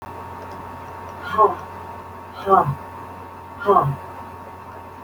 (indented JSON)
{
  "exhalation_length": "5.0 s",
  "exhalation_amplitude": 26321,
  "exhalation_signal_mean_std_ratio": 0.49,
  "survey_phase": "alpha (2021-03-01 to 2021-08-12)",
  "age": "45-64",
  "gender": "Female",
  "wearing_mask": "No",
  "symptom_none": true,
  "smoker_status": "Never smoked",
  "respiratory_condition_asthma": false,
  "respiratory_condition_other": false,
  "recruitment_source": "REACT",
  "submission_delay": "4 days",
  "covid_test_result": "Negative",
  "covid_test_method": "RT-qPCR"
}